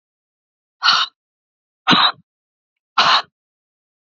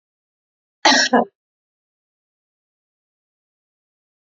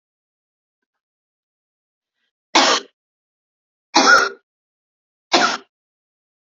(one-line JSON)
{"exhalation_length": "4.2 s", "exhalation_amplitude": 30357, "exhalation_signal_mean_std_ratio": 0.33, "cough_length": "4.4 s", "cough_amplitude": 30141, "cough_signal_mean_std_ratio": 0.22, "three_cough_length": "6.6 s", "three_cough_amplitude": 32258, "three_cough_signal_mean_std_ratio": 0.28, "survey_phase": "beta (2021-08-13 to 2022-03-07)", "age": "45-64", "gender": "Female", "wearing_mask": "No", "symptom_none": true, "symptom_onset": "12 days", "smoker_status": "Current smoker (1 to 10 cigarettes per day)", "respiratory_condition_asthma": false, "respiratory_condition_other": false, "recruitment_source": "REACT", "submission_delay": "4 days", "covid_test_result": "Negative", "covid_test_method": "RT-qPCR", "influenza_a_test_result": "Negative", "influenza_b_test_result": "Negative"}